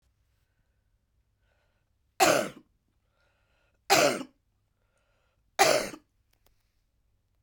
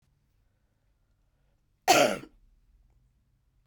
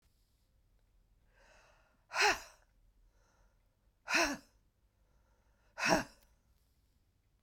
three_cough_length: 7.4 s
three_cough_amplitude: 14997
three_cough_signal_mean_std_ratio: 0.26
cough_length: 3.7 s
cough_amplitude: 15895
cough_signal_mean_std_ratio: 0.22
exhalation_length: 7.4 s
exhalation_amplitude: 6147
exhalation_signal_mean_std_ratio: 0.26
survey_phase: beta (2021-08-13 to 2022-03-07)
age: 45-64
gender: Female
wearing_mask: 'No'
symptom_cough_any: true
symptom_runny_or_blocked_nose: true
symptom_shortness_of_breath: true
symptom_diarrhoea: true
symptom_fatigue: true
symptom_change_to_sense_of_smell_or_taste: true
symptom_loss_of_taste: true
symptom_onset: 4 days
smoker_status: Never smoked
respiratory_condition_asthma: false
respiratory_condition_other: false
recruitment_source: Test and Trace
submission_delay: 1 day
covid_test_result: Positive
covid_test_method: RT-qPCR
covid_ct_value: 17.9
covid_ct_gene: N gene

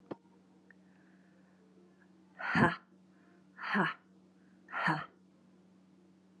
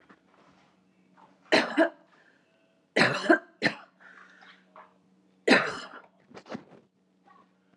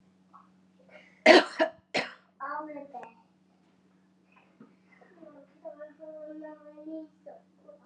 exhalation_length: 6.4 s
exhalation_amplitude: 8422
exhalation_signal_mean_std_ratio: 0.33
three_cough_length: 7.8 s
three_cough_amplitude: 20814
three_cough_signal_mean_std_ratio: 0.29
cough_length: 7.9 s
cough_amplitude: 23021
cough_signal_mean_std_ratio: 0.23
survey_phase: alpha (2021-03-01 to 2021-08-12)
age: 18-44
gender: Female
wearing_mask: 'No'
symptom_none: true
smoker_status: Ex-smoker
respiratory_condition_asthma: true
respiratory_condition_other: false
recruitment_source: Test and Trace
submission_delay: 1 day
covid_test_result: Positive
covid_test_method: RT-qPCR
covid_ct_value: 36.0
covid_ct_gene: ORF1ab gene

